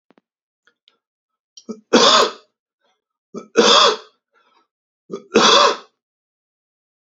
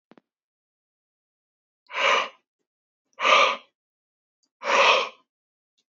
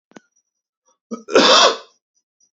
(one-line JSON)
{"three_cough_length": "7.2 s", "three_cough_amplitude": 32768, "three_cough_signal_mean_std_ratio": 0.34, "exhalation_length": "6.0 s", "exhalation_amplitude": 22611, "exhalation_signal_mean_std_ratio": 0.33, "cough_length": "2.6 s", "cough_amplitude": 31378, "cough_signal_mean_std_ratio": 0.35, "survey_phase": "beta (2021-08-13 to 2022-03-07)", "age": "18-44", "gender": "Male", "wearing_mask": "No", "symptom_none": true, "smoker_status": "Ex-smoker", "respiratory_condition_asthma": false, "respiratory_condition_other": false, "recruitment_source": "REACT", "submission_delay": "1 day", "covid_test_result": "Negative", "covid_test_method": "RT-qPCR"}